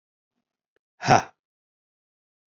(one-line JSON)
{"exhalation_length": "2.5 s", "exhalation_amplitude": 27687, "exhalation_signal_mean_std_ratio": 0.18, "survey_phase": "alpha (2021-03-01 to 2021-08-12)", "age": "18-44", "gender": "Male", "wearing_mask": "No", "symptom_cough_any": true, "symptom_shortness_of_breath": true, "symptom_fatigue": true, "symptom_change_to_sense_of_smell_or_taste": true, "symptom_loss_of_taste": true, "symptom_onset": "5 days", "smoker_status": "Ex-smoker", "respiratory_condition_asthma": false, "respiratory_condition_other": false, "recruitment_source": "Test and Trace", "submission_delay": "2 days", "covid_test_result": "Positive", "covid_test_method": "RT-qPCR", "covid_ct_value": 16.0, "covid_ct_gene": "N gene", "covid_ct_mean": 16.1, "covid_viral_load": "5300000 copies/ml", "covid_viral_load_category": "High viral load (>1M copies/ml)"}